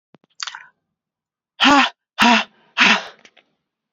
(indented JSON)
{
  "exhalation_length": "3.9 s",
  "exhalation_amplitude": 30664,
  "exhalation_signal_mean_std_ratio": 0.36,
  "survey_phase": "beta (2021-08-13 to 2022-03-07)",
  "age": "45-64",
  "gender": "Female",
  "wearing_mask": "No",
  "symptom_cough_any": true,
  "symptom_runny_or_blocked_nose": true,
  "symptom_sore_throat": true,
  "symptom_fatigue": true,
  "symptom_headache": true,
  "symptom_change_to_sense_of_smell_or_taste": true,
  "symptom_loss_of_taste": true,
  "symptom_other": true,
  "symptom_onset": "5 days",
  "smoker_status": "Never smoked",
  "respiratory_condition_asthma": false,
  "respiratory_condition_other": false,
  "recruitment_source": "Test and Trace",
  "submission_delay": "2 days",
  "covid_test_result": "Positive",
  "covid_test_method": "RT-qPCR",
  "covid_ct_value": 14.8,
  "covid_ct_gene": "ORF1ab gene",
  "covid_ct_mean": 15.8,
  "covid_viral_load": "6500000 copies/ml",
  "covid_viral_load_category": "High viral load (>1M copies/ml)"
}